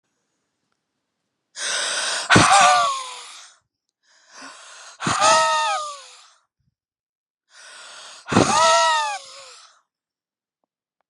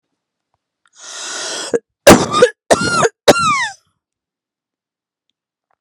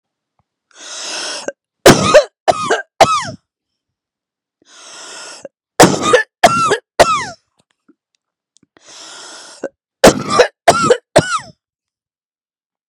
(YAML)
exhalation_length: 11.1 s
exhalation_amplitude: 32761
exhalation_signal_mean_std_ratio: 0.43
cough_length: 5.8 s
cough_amplitude: 32768
cough_signal_mean_std_ratio: 0.36
three_cough_length: 12.9 s
three_cough_amplitude: 32768
three_cough_signal_mean_std_ratio: 0.36
survey_phase: beta (2021-08-13 to 2022-03-07)
age: 45-64
gender: Female
wearing_mask: 'No'
symptom_none: true
smoker_status: Never smoked
respiratory_condition_asthma: false
respiratory_condition_other: false
recruitment_source: REACT
submission_delay: 1 day
covid_test_result: Negative
covid_test_method: RT-qPCR